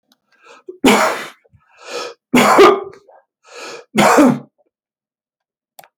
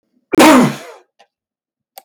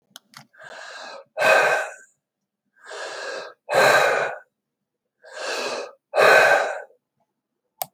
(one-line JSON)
{"three_cough_length": "6.0 s", "three_cough_amplitude": 32767, "three_cough_signal_mean_std_ratio": 0.4, "cough_length": "2.0 s", "cough_amplitude": 32768, "cough_signal_mean_std_ratio": 0.39, "exhalation_length": "7.9 s", "exhalation_amplitude": 25292, "exhalation_signal_mean_std_ratio": 0.44, "survey_phase": "beta (2021-08-13 to 2022-03-07)", "age": "65+", "gender": "Male", "wearing_mask": "No", "symptom_none": true, "smoker_status": "Never smoked", "respiratory_condition_asthma": false, "respiratory_condition_other": false, "recruitment_source": "REACT", "submission_delay": "0 days", "covid_test_result": "Negative", "covid_test_method": "RT-qPCR"}